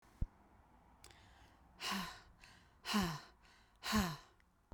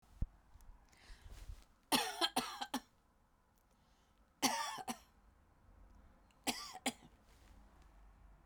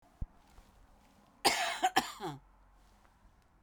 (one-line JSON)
{"exhalation_length": "4.7 s", "exhalation_amplitude": 2368, "exhalation_signal_mean_std_ratio": 0.41, "three_cough_length": "8.5 s", "three_cough_amplitude": 4666, "three_cough_signal_mean_std_ratio": 0.36, "cough_length": "3.6 s", "cough_amplitude": 8331, "cough_signal_mean_std_ratio": 0.34, "survey_phase": "beta (2021-08-13 to 2022-03-07)", "age": "45-64", "gender": "Female", "wearing_mask": "No", "symptom_cough_any": true, "symptom_fatigue": true, "symptom_onset": "6 days", "smoker_status": "Never smoked", "respiratory_condition_asthma": false, "respiratory_condition_other": false, "recruitment_source": "Test and Trace", "submission_delay": "2 days", "covid_test_result": "Positive", "covid_test_method": "RT-qPCR", "covid_ct_value": 22.4, "covid_ct_gene": "N gene", "covid_ct_mean": 23.2, "covid_viral_load": "24000 copies/ml", "covid_viral_load_category": "Low viral load (10K-1M copies/ml)"}